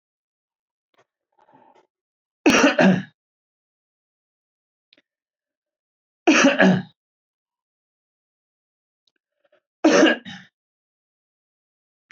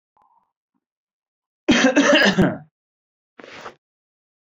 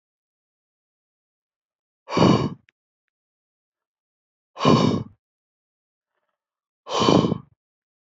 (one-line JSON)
{"three_cough_length": "12.1 s", "three_cough_amplitude": 23545, "three_cough_signal_mean_std_ratio": 0.27, "cough_length": "4.4 s", "cough_amplitude": 24619, "cough_signal_mean_std_ratio": 0.37, "exhalation_length": "8.2 s", "exhalation_amplitude": 26050, "exhalation_signal_mean_std_ratio": 0.29, "survey_phase": "beta (2021-08-13 to 2022-03-07)", "age": "18-44", "gender": "Male", "wearing_mask": "No", "symptom_cough_any": true, "symptom_runny_or_blocked_nose": true, "symptom_sore_throat": true, "symptom_fatigue": true, "symptom_headache": true, "symptom_onset": "3 days", "smoker_status": "Never smoked", "respiratory_condition_asthma": false, "respiratory_condition_other": false, "recruitment_source": "Test and Trace", "submission_delay": "1 day", "covid_test_result": "Positive", "covid_test_method": "ePCR"}